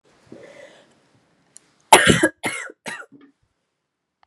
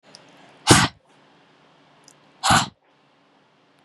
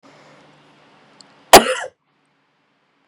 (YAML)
three_cough_length: 4.3 s
three_cough_amplitude: 32768
three_cough_signal_mean_std_ratio: 0.25
exhalation_length: 3.8 s
exhalation_amplitude: 32768
exhalation_signal_mean_std_ratio: 0.27
cough_length: 3.1 s
cough_amplitude: 32768
cough_signal_mean_std_ratio: 0.19
survey_phase: beta (2021-08-13 to 2022-03-07)
age: 18-44
gender: Female
wearing_mask: 'No'
symptom_cough_any: true
symptom_new_continuous_cough: true
symptom_runny_or_blocked_nose: true
symptom_shortness_of_breath: true
symptom_sore_throat: true
symptom_abdominal_pain: true
symptom_fatigue: true
symptom_fever_high_temperature: true
symptom_headache: true
symptom_change_to_sense_of_smell_or_taste: true
symptom_other: true
symptom_onset: 4 days
smoker_status: Never smoked
respiratory_condition_asthma: false
respiratory_condition_other: false
recruitment_source: Test and Trace
submission_delay: 2 days
covid_test_result: Positive
covid_test_method: RT-qPCR
covid_ct_value: 28.6
covid_ct_gene: ORF1ab gene
covid_ct_mean: 28.8
covid_viral_load: 360 copies/ml
covid_viral_load_category: Minimal viral load (< 10K copies/ml)